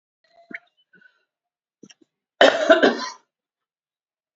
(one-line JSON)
{"cough_length": "4.4 s", "cough_amplitude": 32768, "cough_signal_mean_std_ratio": 0.26, "survey_phase": "beta (2021-08-13 to 2022-03-07)", "age": "65+", "gender": "Female", "wearing_mask": "No", "symptom_cough_any": true, "symptom_runny_or_blocked_nose": true, "symptom_fatigue": true, "symptom_headache": true, "symptom_onset": "2 days", "smoker_status": "Ex-smoker", "respiratory_condition_asthma": false, "respiratory_condition_other": false, "recruitment_source": "Test and Trace", "submission_delay": "1 day", "covid_test_result": "Positive", "covid_test_method": "ePCR"}